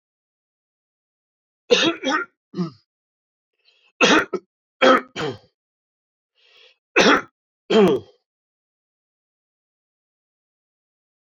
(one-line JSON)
{"three_cough_length": "11.3 s", "three_cough_amplitude": 27723, "three_cough_signal_mean_std_ratio": 0.3, "survey_phase": "beta (2021-08-13 to 2022-03-07)", "age": "65+", "gender": "Male", "wearing_mask": "No", "symptom_runny_or_blocked_nose": true, "symptom_headache": true, "symptom_onset": "8 days", "smoker_status": "Never smoked", "respiratory_condition_asthma": false, "respiratory_condition_other": false, "recruitment_source": "REACT", "submission_delay": "1 day", "covid_test_result": "Negative", "covid_test_method": "RT-qPCR"}